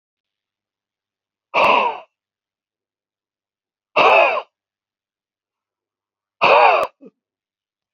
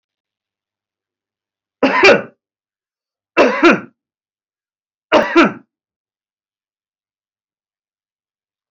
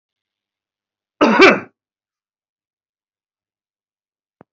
exhalation_length: 7.9 s
exhalation_amplitude: 29496
exhalation_signal_mean_std_ratio: 0.32
three_cough_length: 8.7 s
three_cough_amplitude: 32768
three_cough_signal_mean_std_ratio: 0.28
cough_length: 4.5 s
cough_amplitude: 32679
cough_signal_mean_std_ratio: 0.23
survey_phase: beta (2021-08-13 to 2022-03-07)
age: 65+
gender: Male
wearing_mask: 'No'
symptom_none: true
smoker_status: Ex-smoker
respiratory_condition_asthma: false
respiratory_condition_other: false
recruitment_source: REACT
submission_delay: 3 days
covid_test_result: Negative
covid_test_method: RT-qPCR
influenza_a_test_result: Negative
influenza_b_test_result: Negative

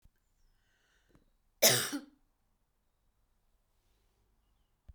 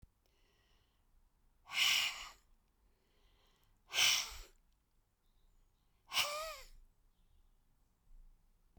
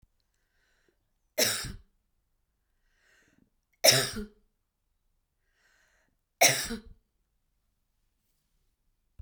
cough_length: 4.9 s
cough_amplitude: 10214
cough_signal_mean_std_ratio: 0.19
exhalation_length: 8.8 s
exhalation_amplitude: 4153
exhalation_signal_mean_std_ratio: 0.31
three_cough_length: 9.2 s
three_cough_amplitude: 18384
three_cough_signal_mean_std_ratio: 0.22
survey_phase: beta (2021-08-13 to 2022-03-07)
age: 65+
gender: Female
wearing_mask: 'No'
symptom_none: true
smoker_status: Ex-smoker
respiratory_condition_asthma: false
respiratory_condition_other: false
recruitment_source: REACT
submission_delay: 2 days
covid_test_result: Negative
covid_test_method: RT-qPCR
influenza_a_test_result: Negative
influenza_b_test_result: Negative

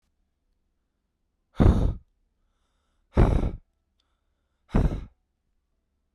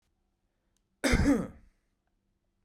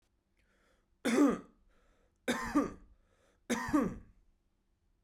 exhalation_length: 6.1 s
exhalation_amplitude: 20657
exhalation_signal_mean_std_ratio: 0.3
cough_length: 2.6 s
cough_amplitude: 8750
cough_signal_mean_std_ratio: 0.33
three_cough_length: 5.0 s
three_cough_amplitude: 4726
three_cough_signal_mean_std_ratio: 0.37
survey_phase: beta (2021-08-13 to 2022-03-07)
age: 18-44
gender: Male
wearing_mask: 'No'
symptom_none: true
symptom_onset: 4 days
smoker_status: Ex-smoker
respiratory_condition_asthma: false
respiratory_condition_other: false
recruitment_source: Test and Trace
submission_delay: 2 days
covid_test_result: Positive
covid_test_method: ePCR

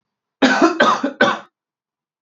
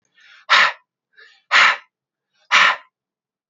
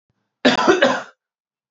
three_cough_length: 2.2 s
three_cough_amplitude: 32768
three_cough_signal_mean_std_ratio: 0.49
exhalation_length: 3.5 s
exhalation_amplitude: 29055
exhalation_signal_mean_std_ratio: 0.36
cough_length: 1.7 s
cough_amplitude: 28063
cough_signal_mean_std_ratio: 0.44
survey_phase: beta (2021-08-13 to 2022-03-07)
age: 18-44
gender: Male
wearing_mask: 'No'
symptom_cough_any: true
symptom_headache: true
symptom_onset: 2 days
smoker_status: Never smoked
respiratory_condition_asthma: false
respiratory_condition_other: false
recruitment_source: Test and Trace
submission_delay: 1 day
covid_test_result: Positive
covid_test_method: RT-qPCR
covid_ct_value: 28.0
covid_ct_gene: N gene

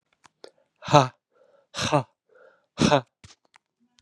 exhalation_length: 4.0 s
exhalation_amplitude: 32748
exhalation_signal_mean_std_ratio: 0.26
survey_phase: beta (2021-08-13 to 2022-03-07)
age: 18-44
gender: Male
wearing_mask: 'No'
symptom_cough_any: true
symptom_runny_or_blocked_nose: true
symptom_sore_throat: true
symptom_fatigue: true
symptom_onset: 2 days
smoker_status: Never smoked
respiratory_condition_asthma: false
respiratory_condition_other: false
recruitment_source: Test and Trace
submission_delay: 1 day
covid_test_result: Positive
covid_test_method: ePCR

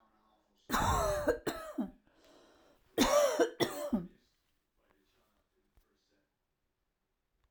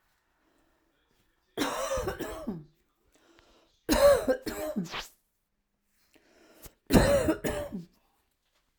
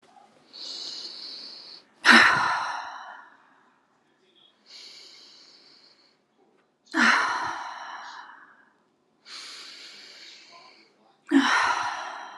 cough_length: 7.5 s
cough_amplitude: 5532
cough_signal_mean_std_ratio: 0.4
three_cough_length: 8.8 s
three_cough_amplitude: 17109
three_cough_signal_mean_std_ratio: 0.38
exhalation_length: 12.4 s
exhalation_amplitude: 31108
exhalation_signal_mean_std_ratio: 0.37
survey_phase: alpha (2021-03-01 to 2021-08-12)
age: 18-44
gender: Female
wearing_mask: 'No'
symptom_fatigue: true
symptom_headache: true
smoker_status: Ex-smoker
respiratory_condition_asthma: false
respiratory_condition_other: false
recruitment_source: REACT
submission_delay: 1 day
covid_test_result: Negative
covid_test_method: RT-qPCR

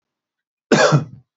cough_length: 1.4 s
cough_amplitude: 27492
cough_signal_mean_std_ratio: 0.4
survey_phase: beta (2021-08-13 to 2022-03-07)
age: 45-64
gender: Male
wearing_mask: 'No'
symptom_cough_any: true
symptom_runny_or_blocked_nose: true
symptom_sore_throat: true
symptom_fatigue: true
symptom_other: true
smoker_status: Never smoked
respiratory_condition_asthma: false
respiratory_condition_other: false
recruitment_source: Test and Trace
submission_delay: 1 day
covid_test_result: Positive
covid_test_method: RT-qPCR
covid_ct_value: 20.3
covid_ct_gene: ORF1ab gene
covid_ct_mean: 20.8
covid_viral_load: 150000 copies/ml
covid_viral_load_category: Low viral load (10K-1M copies/ml)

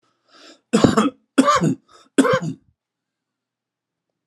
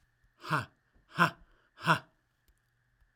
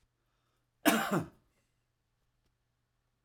three_cough_length: 4.3 s
three_cough_amplitude: 32767
three_cough_signal_mean_std_ratio: 0.38
exhalation_length: 3.2 s
exhalation_amplitude: 9540
exhalation_signal_mean_std_ratio: 0.28
cough_length: 3.2 s
cough_amplitude: 9331
cough_signal_mean_std_ratio: 0.26
survey_phase: alpha (2021-03-01 to 2021-08-12)
age: 65+
gender: Male
wearing_mask: 'No'
symptom_none: true
smoker_status: Ex-smoker
respiratory_condition_asthma: false
respiratory_condition_other: false
recruitment_source: REACT
submission_delay: 5 days
covid_test_result: Negative
covid_test_method: RT-qPCR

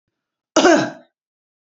cough_length: 1.8 s
cough_amplitude: 31507
cough_signal_mean_std_ratio: 0.33
survey_phase: beta (2021-08-13 to 2022-03-07)
age: 45-64
gender: Female
wearing_mask: 'No'
symptom_none: true
smoker_status: Ex-smoker
respiratory_condition_asthma: false
respiratory_condition_other: false
recruitment_source: REACT
submission_delay: 1 day
covid_test_result: Negative
covid_test_method: RT-qPCR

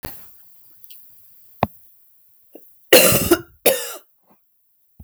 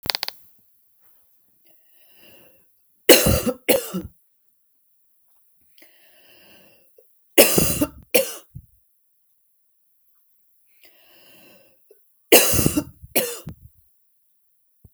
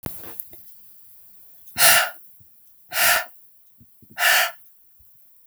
cough_length: 5.0 s
cough_amplitude: 32768
cough_signal_mean_std_ratio: 0.31
three_cough_length: 14.9 s
three_cough_amplitude: 32768
three_cough_signal_mean_std_ratio: 0.27
exhalation_length: 5.5 s
exhalation_amplitude: 32768
exhalation_signal_mean_std_ratio: 0.4
survey_phase: beta (2021-08-13 to 2022-03-07)
age: 18-44
gender: Female
wearing_mask: 'No'
symptom_cough_any: true
symptom_runny_or_blocked_nose: true
symptom_sore_throat: true
symptom_other: true
smoker_status: Never smoked
respiratory_condition_asthma: true
respiratory_condition_other: false
recruitment_source: Test and Trace
submission_delay: 2 days
covid_test_result: Positive
covid_test_method: ePCR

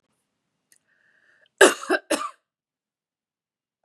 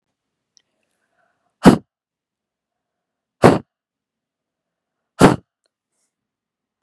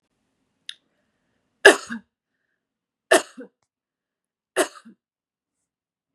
cough_length: 3.8 s
cough_amplitude: 32767
cough_signal_mean_std_ratio: 0.2
exhalation_length: 6.8 s
exhalation_amplitude: 32768
exhalation_signal_mean_std_ratio: 0.18
three_cough_length: 6.1 s
three_cough_amplitude: 32768
three_cough_signal_mean_std_ratio: 0.16
survey_phase: beta (2021-08-13 to 2022-03-07)
age: 45-64
gender: Female
wearing_mask: 'No'
symptom_none: true
symptom_onset: 5 days
smoker_status: Ex-smoker
respiratory_condition_asthma: false
respiratory_condition_other: false
recruitment_source: REACT
submission_delay: 3 days
covid_test_result: Negative
covid_test_method: RT-qPCR
influenza_a_test_result: Negative
influenza_b_test_result: Negative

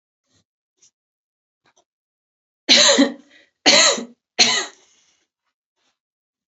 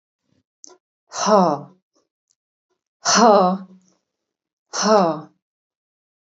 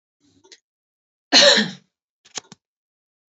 three_cough_length: 6.5 s
three_cough_amplitude: 32768
three_cough_signal_mean_std_ratio: 0.31
exhalation_length: 6.3 s
exhalation_amplitude: 27867
exhalation_signal_mean_std_ratio: 0.35
cough_length: 3.3 s
cough_amplitude: 32443
cough_signal_mean_std_ratio: 0.26
survey_phase: beta (2021-08-13 to 2022-03-07)
age: 45-64
gender: Female
wearing_mask: 'No'
symptom_none: true
symptom_onset: 2 days
smoker_status: Never smoked
respiratory_condition_asthma: false
respiratory_condition_other: false
recruitment_source: REACT
submission_delay: 1 day
covid_test_result: Negative
covid_test_method: RT-qPCR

